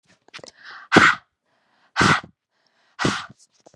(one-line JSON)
{"exhalation_length": "3.8 s", "exhalation_amplitude": 32768, "exhalation_signal_mean_std_ratio": 0.32, "survey_phase": "beta (2021-08-13 to 2022-03-07)", "age": "18-44", "gender": "Female", "wearing_mask": "No", "symptom_cough_any": true, "symptom_runny_or_blocked_nose": true, "symptom_fatigue": true, "symptom_headache": true, "symptom_onset": "3 days", "smoker_status": "Never smoked", "recruitment_source": "Test and Trace", "submission_delay": "2 days", "covid_test_result": "Positive", "covid_test_method": "RT-qPCR", "covid_ct_value": 30.1, "covid_ct_gene": "ORF1ab gene"}